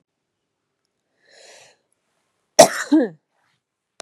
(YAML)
cough_length: 4.0 s
cough_amplitude: 32768
cough_signal_mean_std_ratio: 0.2
survey_phase: beta (2021-08-13 to 2022-03-07)
age: 18-44
gender: Female
wearing_mask: 'No'
symptom_cough_any: true
symptom_runny_or_blocked_nose: true
smoker_status: Never smoked
respiratory_condition_asthma: false
respiratory_condition_other: false
recruitment_source: REACT
submission_delay: 1 day
covid_test_result: Negative
covid_test_method: RT-qPCR
influenza_a_test_result: Negative
influenza_b_test_result: Negative